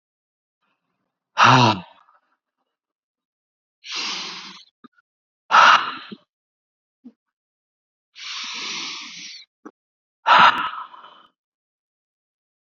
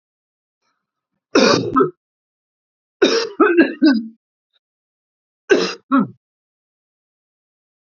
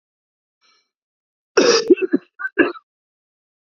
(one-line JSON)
{"exhalation_length": "12.8 s", "exhalation_amplitude": 28212, "exhalation_signal_mean_std_ratio": 0.28, "three_cough_length": "7.9 s", "three_cough_amplitude": 29879, "three_cough_signal_mean_std_ratio": 0.36, "cough_length": "3.7 s", "cough_amplitude": 28467, "cough_signal_mean_std_ratio": 0.31, "survey_phase": "beta (2021-08-13 to 2022-03-07)", "age": "18-44", "gender": "Male", "wearing_mask": "No", "symptom_cough_any": true, "symptom_runny_or_blocked_nose": true, "symptom_shortness_of_breath": true, "symptom_sore_throat": true, "symptom_fatigue": true, "symptom_headache": true, "symptom_change_to_sense_of_smell_or_taste": true, "symptom_onset": "2 days", "smoker_status": "Ex-smoker", "respiratory_condition_asthma": false, "respiratory_condition_other": false, "recruitment_source": "Test and Trace", "submission_delay": "2 days", "covid_test_result": "Negative", "covid_test_method": "RT-qPCR"}